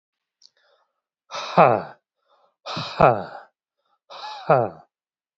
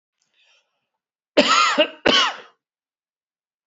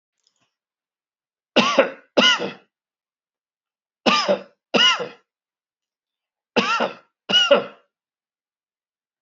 {
  "exhalation_length": "5.4 s",
  "exhalation_amplitude": 27683,
  "exhalation_signal_mean_std_ratio": 0.29,
  "cough_length": "3.7 s",
  "cough_amplitude": 28412,
  "cough_signal_mean_std_ratio": 0.36,
  "three_cough_length": "9.2 s",
  "three_cough_amplitude": 28653,
  "three_cough_signal_mean_std_ratio": 0.35,
  "survey_phase": "beta (2021-08-13 to 2022-03-07)",
  "age": "45-64",
  "gender": "Male",
  "wearing_mask": "No",
  "symptom_cough_any": true,
  "symptom_fatigue": true,
  "symptom_change_to_sense_of_smell_or_taste": true,
  "smoker_status": "Ex-smoker",
  "respiratory_condition_asthma": false,
  "respiratory_condition_other": false,
  "recruitment_source": "Test and Trace",
  "submission_delay": "2 days",
  "covid_test_result": "Positive",
  "covid_test_method": "RT-qPCR",
  "covid_ct_value": 18.5,
  "covid_ct_gene": "ORF1ab gene",
  "covid_ct_mean": 19.4,
  "covid_viral_load": "420000 copies/ml",
  "covid_viral_load_category": "Low viral load (10K-1M copies/ml)"
}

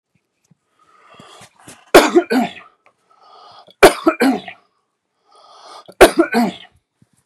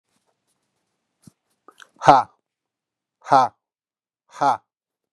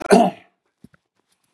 {
  "three_cough_length": "7.3 s",
  "three_cough_amplitude": 32768,
  "three_cough_signal_mean_std_ratio": 0.3,
  "exhalation_length": "5.1 s",
  "exhalation_amplitude": 32768,
  "exhalation_signal_mean_std_ratio": 0.23,
  "cough_length": "1.5 s",
  "cough_amplitude": 32768,
  "cough_signal_mean_std_ratio": 0.29,
  "survey_phase": "beta (2021-08-13 to 2022-03-07)",
  "age": "45-64",
  "gender": "Male",
  "wearing_mask": "No",
  "symptom_none": true,
  "smoker_status": "Ex-smoker",
  "respiratory_condition_asthma": false,
  "respiratory_condition_other": false,
  "recruitment_source": "Test and Trace",
  "submission_delay": "1 day",
  "covid_test_result": "Negative",
  "covid_test_method": "LFT"
}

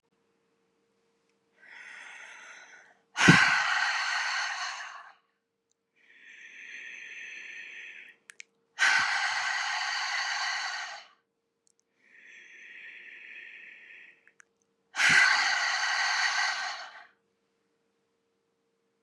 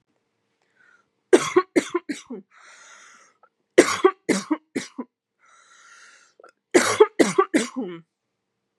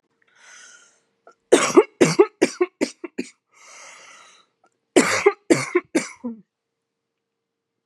{
  "exhalation_length": "19.0 s",
  "exhalation_amplitude": 20492,
  "exhalation_signal_mean_std_ratio": 0.45,
  "three_cough_length": "8.8 s",
  "three_cough_amplitude": 32767,
  "three_cough_signal_mean_std_ratio": 0.3,
  "cough_length": "7.9 s",
  "cough_amplitude": 31683,
  "cough_signal_mean_std_ratio": 0.3,
  "survey_phase": "beta (2021-08-13 to 2022-03-07)",
  "age": "45-64",
  "gender": "Female",
  "wearing_mask": "No",
  "symptom_cough_any": true,
  "symptom_shortness_of_breath": true,
  "symptom_sore_throat": true,
  "symptom_diarrhoea": true,
  "symptom_fatigue": true,
  "symptom_headache": true,
  "symptom_change_to_sense_of_smell_or_taste": true,
  "symptom_onset": "5 days",
  "smoker_status": "Ex-smoker",
  "respiratory_condition_asthma": false,
  "respiratory_condition_other": false,
  "recruitment_source": "Test and Trace",
  "submission_delay": "1 day",
  "covid_test_result": "Positive",
  "covid_test_method": "ePCR"
}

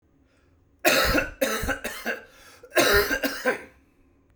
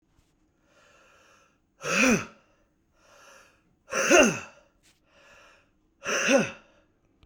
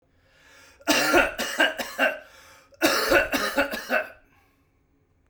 {
  "cough_length": "4.4 s",
  "cough_amplitude": 17723,
  "cough_signal_mean_std_ratio": 0.52,
  "exhalation_length": "7.3 s",
  "exhalation_amplitude": 18316,
  "exhalation_signal_mean_std_ratio": 0.33,
  "three_cough_length": "5.3 s",
  "three_cough_amplitude": 19547,
  "three_cough_signal_mean_std_ratio": 0.51,
  "survey_phase": "beta (2021-08-13 to 2022-03-07)",
  "age": "45-64",
  "gender": "Male",
  "wearing_mask": "No",
  "symptom_cough_any": true,
  "symptom_runny_or_blocked_nose": true,
  "symptom_headache": true,
  "symptom_onset": "3 days",
  "smoker_status": "Ex-smoker",
  "respiratory_condition_asthma": false,
  "respiratory_condition_other": false,
  "recruitment_source": "Test and Trace",
  "submission_delay": "1 day",
  "covid_test_result": "Positive",
  "covid_test_method": "RT-qPCR",
  "covid_ct_value": 26.0,
  "covid_ct_gene": "ORF1ab gene",
  "covid_ct_mean": 26.4,
  "covid_viral_load": "2100 copies/ml",
  "covid_viral_load_category": "Minimal viral load (< 10K copies/ml)"
}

